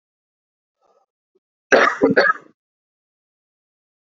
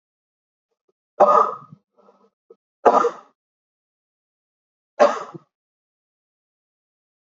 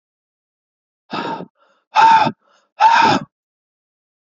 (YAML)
cough_length: 4.1 s
cough_amplitude: 27957
cough_signal_mean_std_ratio: 0.28
three_cough_length: 7.3 s
three_cough_amplitude: 30225
three_cough_signal_mean_std_ratio: 0.24
exhalation_length: 4.4 s
exhalation_amplitude: 27360
exhalation_signal_mean_std_ratio: 0.38
survey_phase: beta (2021-08-13 to 2022-03-07)
age: 45-64
gender: Male
wearing_mask: 'No'
symptom_cough_any: true
symptom_runny_or_blocked_nose: true
symptom_sore_throat: true
symptom_fatigue: true
symptom_headache: true
symptom_onset: 23 days
smoker_status: Never smoked
respiratory_condition_asthma: false
respiratory_condition_other: false
recruitment_source: Test and Trace
submission_delay: 20 days
covid_test_result: Negative
covid_test_method: RT-qPCR